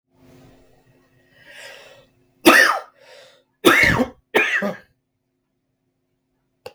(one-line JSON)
{"three_cough_length": "6.7 s", "three_cough_amplitude": 32768, "three_cough_signal_mean_std_ratio": 0.32, "survey_phase": "beta (2021-08-13 to 2022-03-07)", "age": "18-44", "gender": "Male", "wearing_mask": "No", "symptom_none": true, "smoker_status": "Current smoker (e-cigarettes or vapes only)", "respiratory_condition_asthma": false, "respiratory_condition_other": false, "recruitment_source": "REACT", "submission_delay": "1 day", "covid_test_result": "Negative", "covid_test_method": "RT-qPCR"}